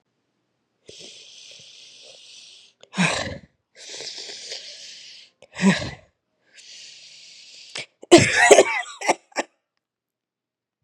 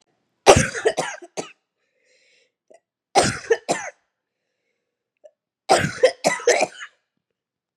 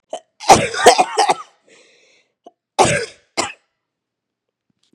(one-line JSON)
{"exhalation_length": "10.8 s", "exhalation_amplitude": 32768, "exhalation_signal_mean_std_ratio": 0.29, "three_cough_length": "7.8 s", "three_cough_amplitude": 32768, "three_cough_signal_mean_std_ratio": 0.32, "cough_length": "4.9 s", "cough_amplitude": 32768, "cough_signal_mean_std_ratio": 0.33, "survey_phase": "beta (2021-08-13 to 2022-03-07)", "age": "18-44", "gender": "Female", "wearing_mask": "No", "symptom_cough_any": true, "symptom_new_continuous_cough": true, "symptom_runny_or_blocked_nose": true, "symptom_onset": "12 days", "smoker_status": "Never smoked", "respiratory_condition_asthma": false, "respiratory_condition_other": true, "recruitment_source": "REACT", "submission_delay": "32 days", "covid_test_result": "Negative", "covid_test_method": "RT-qPCR", "influenza_a_test_result": "Unknown/Void", "influenza_b_test_result": "Unknown/Void"}